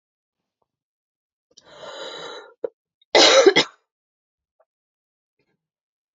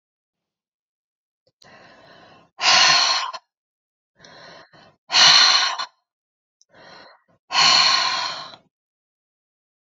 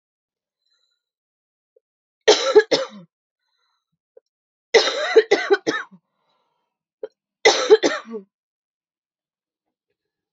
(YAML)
cough_length: 6.1 s
cough_amplitude: 28190
cough_signal_mean_std_ratio: 0.24
exhalation_length: 9.8 s
exhalation_amplitude: 32767
exhalation_signal_mean_std_ratio: 0.38
three_cough_length: 10.3 s
three_cough_amplitude: 31105
three_cough_signal_mean_std_ratio: 0.28
survey_phase: beta (2021-08-13 to 2022-03-07)
age: 18-44
gender: Female
wearing_mask: 'No'
symptom_cough_any: true
symptom_fatigue: true
symptom_fever_high_temperature: true
symptom_headache: true
symptom_other: true
symptom_onset: 4 days
smoker_status: Never smoked
respiratory_condition_asthma: false
respiratory_condition_other: false
recruitment_source: Test and Trace
submission_delay: 3 days
covid_test_result: Positive
covid_test_method: ePCR